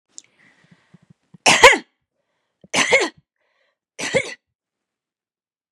{"three_cough_length": "5.7 s", "three_cough_amplitude": 32768, "three_cough_signal_mean_std_ratio": 0.26, "survey_phase": "beta (2021-08-13 to 2022-03-07)", "age": "45-64", "gender": "Female", "wearing_mask": "No", "symptom_none": true, "smoker_status": "Never smoked", "respiratory_condition_asthma": false, "respiratory_condition_other": false, "recruitment_source": "Test and Trace", "submission_delay": "2 days", "covid_test_result": "Negative", "covid_test_method": "RT-qPCR"}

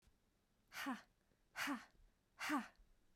{"exhalation_length": "3.2 s", "exhalation_amplitude": 1059, "exhalation_signal_mean_std_ratio": 0.43, "survey_phase": "beta (2021-08-13 to 2022-03-07)", "age": "45-64", "gender": "Female", "wearing_mask": "No", "symptom_fatigue": true, "symptom_onset": "2 days", "smoker_status": "Never smoked", "respiratory_condition_asthma": false, "respiratory_condition_other": false, "recruitment_source": "Test and Trace", "submission_delay": "2 days", "covid_test_result": "Negative", "covid_test_method": "RT-qPCR"}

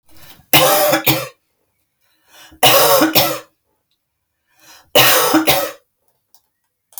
{"three_cough_length": "7.0 s", "three_cough_amplitude": 32768, "three_cough_signal_mean_std_ratio": 0.46, "survey_phase": "alpha (2021-03-01 to 2021-08-12)", "age": "45-64", "gender": "Female", "wearing_mask": "No", "symptom_none": true, "smoker_status": "Current smoker (1 to 10 cigarettes per day)", "respiratory_condition_asthma": false, "respiratory_condition_other": false, "recruitment_source": "REACT", "submission_delay": "1 day", "covid_test_result": "Negative", "covid_test_method": "RT-qPCR"}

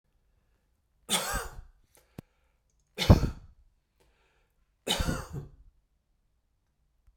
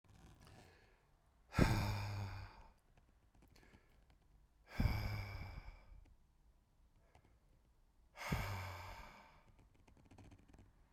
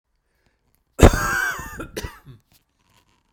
{"three_cough_length": "7.2 s", "three_cough_amplitude": 21423, "three_cough_signal_mean_std_ratio": 0.24, "exhalation_length": "10.9 s", "exhalation_amplitude": 4438, "exhalation_signal_mean_std_ratio": 0.39, "cough_length": "3.3 s", "cough_amplitude": 32768, "cough_signal_mean_std_ratio": 0.27, "survey_phase": "beta (2021-08-13 to 2022-03-07)", "age": "45-64", "gender": "Male", "wearing_mask": "No", "symptom_none": true, "smoker_status": "Never smoked", "respiratory_condition_asthma": false, "respiratory_condition_other": false, "recruitment_source": "Test and Trace", "submission_delay": "0 days", "covid_test_result": "Negative", "covid_test_method": "LFT"}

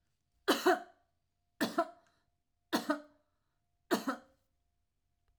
{"cough_length": "5.4 s", "cough_amplitude": 5619, "cough_signal_mean_std_ratio": 0.3, "survey_phase": "alpha (2021-03-01 to 2021-08-12)", "age": "45-64", "gender": "Female", "wearing_mask": "No", "symptom_none": true, "smoker_status": "Never smoked", "respiratory_condition_asthma": false, "respiratory_condition_other": false, "recruitment_source": "REACT", "submission_delay": "1 day", "covid_test_result": "Negative", "covid_test_method": "RT-qPCR"}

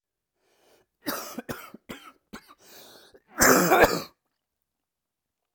{"cough_length": "5.5 s", "cough_amplitude": 22822, "cough_signal_mean_std_ratio": 0.3, "survey_phase": "alpha (2021-03-01 to 2021-08-12)", "age": "18-44", "gender": "Male", "wearing_mask": "No", "symptom_cough_any": true, "symptom_new_continuous_cough": true, "symptom_shortness_of_breath": true, "symptom_diarrhoea": true, "symptom_fatigue": true, "symptom_fever_high_temperature": true, "symptom_headache": true, "symptom_change_to_sense_of_smell_or_taste": true, "symptom_loss_of_taste": true, "symptom_onset": "5 days", "smoker_status": "Never smoked", "respiratory_condition_asthma": false, "respiratory_condition_other": false, "recruitment_source": "Test and Trace", "submission_delay": "2 days", "covid_test_result": "Positive", "covid_test_method": "ePCR"}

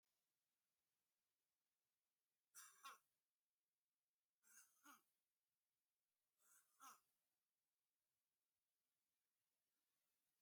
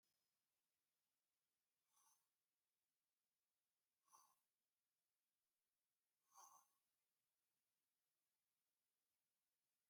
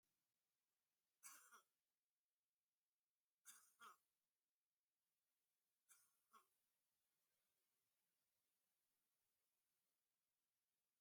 {"three_cough_length": "10.4 s", "three_cough_amplitude": 147, "three_cough_signal_mean_std_ratio": 0.27, "exhalation_length": "9.9 s", "exhalation_amplitude": 53, "exhalation_signal_mean_std_ratio": 0.3, "cough_length": "11.0 s", "cough_amplitude": 168, "cough_signal_mean_std_ratio": 0.28, "survey_phase": "alpha (2021-03-01 to 2021-08-12)", "age": "65+", "gender": "Male", "wearing_mask": "No", "symptom_fatigue": true, "smoker_status": "Never smoked", "respiratory_condition_asthma": false, "respiratory_condition_other": false, "recruitment_source": "REACT", "submission_delay": "1 day", "covid_test_result": "Negative", "covid_test_method": "RT-qPCR"}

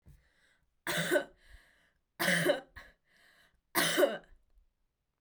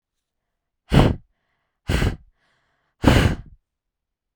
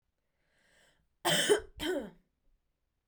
{"three_cough_length": "5.2 s", "three_cough_amplitude": 6810, "three_cough_signal_mean_std_ratio": 0.39, "exhalation_length": "4.4 s", "exhalation_amplitude": 31632, "exhalation_signal_mean_std_ratio": 0.33, "cough_length": "3.1 s", "cough_amplitude": 6802, "cough_signal_mean_std_ratio": 0.35, "survey_phase": "beta (2021-08-13 to 2022-03-07)", "age": "18-44", "gender": "Female", "wearing_mask": "No", "symptom_none": true, "smoker_status": "Never smoked", "respiratory_condition_asthma": false, "respiratory_condition_other": false, "recruitment_source": "REACT", "submission_delay": "1 day", "covid_test_result": "Negative", "covid_test_method": "RT-qPCR"}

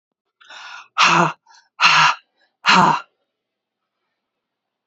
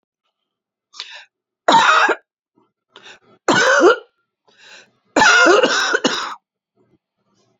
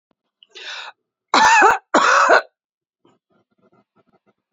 {"exhalation_length": "4.9 s", "exhalation_amplitude": 32768, "exhalation_signal_mean_std_ratio": 0.38, "three_cough_length": "7.6 s", "three_cough_amplitude": 32767, "three_cough_signal_mean_std_ratio": 0.43, "cough_length": "4.5 s", "cough_amplitude": 28475, "cough_signal_mean_std_ratio": 0.39, "survey_phase": "beta (2021-08-13 to 2022-03-07)", "age": "45-64", "gender": "Female", "wearing_mask": "No", "symptom_runny_or_blocked_nose": true, "smoker_status": "Never smoked", "respiratory_condition_asthma": false, "respiratory_condition_other": false, "recruitment_source": "REACT", "submission_delay": "3 days", "covid_test_result": "Negative", "covid_test_method": "RT-qPCR"}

